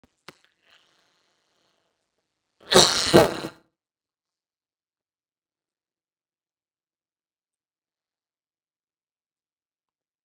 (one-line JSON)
{"cough_length": "10.2 s", "cough_amplitude": 32768, "cough_signal_mean_std_ratio": 0.13, "survey_phase": "beta (2021-08-13 to 2022-03-07)", "age": "65+", "gender": "Female", "wearing_mask": "No", "symptom_runny_or_blocked_nose": true, "smoker_status": "Ex-smoker", "respiratory_condition_asthma": false, "respiratory_condition_other": false, "recruitment_source": "REACT", "submission_delay": "1 day", "covid_test_result": "Negative", "covid_test_method": "RT-qPCR", "influenza_a_test_result": "Negative", "influenza_b_test_result": "Negative"}